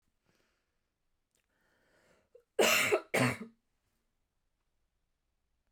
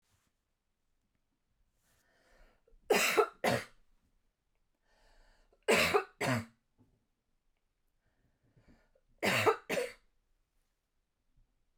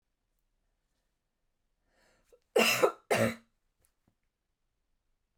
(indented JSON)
{
  "exhalation_length": "5.7 s",
  "exhalation_amplitude": 6460,
  "exhalation_signal_mean_std_ratio": 0.27,
  "three_cough_length": "11.8 s",
  "three_cough_amplitude": 6191,
  "three_cough_signal_mean_std_ratio": 0.3,
  "cough_length": "5.4 s",
  "cough_amplitude": 9516,
  "cough_signal_mean_std_ratio": 0.25,
  "survey_phase": "beta (2021-08-13 to 2022-03-07)",
  "age": "18-44",
  "gender": "Female",
  "wearing_mask": "No",
  "symptom_fatigue": true,
  "symptom_onset": "3 days",
  "smoker_status": "Never smoked",
  "respiratory_condition_asthma": false,
  "respiratory_condition_other": false,
  "recruitment_source": "REACT",
  "submission_delay": "1 day",
  "covid_test_result": "Negative",
  "covid_test_method": "RT-qPCR"
}